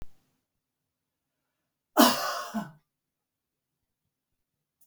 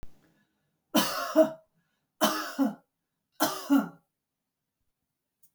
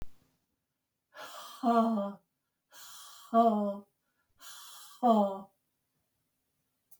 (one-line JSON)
{"cough_length": "4.9 s", "cough_amplitude": 19997, "cough_signal_mean_std_ratio": 0.23, "three_cough_length": "5.5 s", "three_cough_amplitude": 11772, "three_cough_signal_mean_std_ratio": 0.36, "exhalation_length": "7.0 s", "exhalation_amplitude": 6484, "exhalation_signal_mean_std_ratio": 0.38, "survey_phase": "beta (2021-08-13 to 2022-03-07)", "age": "65+", "gender": "Female", "wearing_mask": "No", "symptom_none": true, "smoker_status": "Never smoked", "respiratory_condition_asthma": false, "respiratory_condition_other": false, "recruitment_source": "REACT", "submission_delay": "2 days", "covid_test_result": "Negative", "covid_test_method": "RT-qPCR", "influenza_a_test_result": "Negative", "influenza_b_test_result": "Negative"}